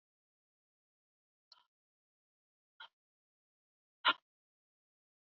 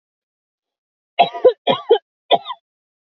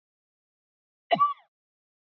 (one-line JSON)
{"exhalation_length": "5.3 s", "exhalation_amplitude": 4338, "exhalation_signal_mean_std_ratio": 0.1, "three_cough_length": "3.1 s", "three_cough_amplitude": 28336, "three_cough_signal_mean_std_ratio": 0.3, "cough_length": "2.0 s", "cough_amplitude": 9592, "cough_signal_mean_std_ratio": 0.24, "survey_phase": "beta (2021-08-13 to 2022-03-07)", "age": "18-44", "gender": "Female", "wearing_mask": "No", "symptom_none": true, "smoker_status": "Never smoked", "respiratory_condition_asthma": true, "respiratory_condition_other": false, "recruitment_source": "REACT", "submission_delay": "1 day", "covid_test_result": "Negative", "covid_test_method": "RT-qPCR", "influenza_a_test_result": "Negative", "influenza_b_test_result": "Negative"}